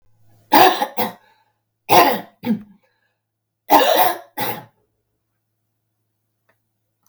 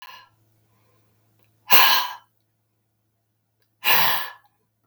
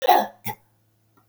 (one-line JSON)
{"three_cough_length": "7.1 s", "three_cough_amplitude": 32768, "three_cough_signal_mean_std_ratio": 0.35, "exhalation_length": "4.9 s", "exhalation_amplitude": 32768, "exhalation_signal_mean_std_ratio": 0.31, "cough_length": "1.3 s", "cough_amplitude": 21374, "cough_signal_mean_std_ratio": 0.35, "survey_phase": "beta (2021-08-13 to 2022-03-07)", "age": "65+", "gender": "Female", "wearing_mask": "No", "symptom_none": true, "smoker_status": "Never smoked", "respiratory_condition_asthma": false, "respiratory_condition_other": false, "recruitment_source": "Test and Trace", "submission_delay": "0 days", "covid_test_result": "Negative", "covid_test_method": "LFT"}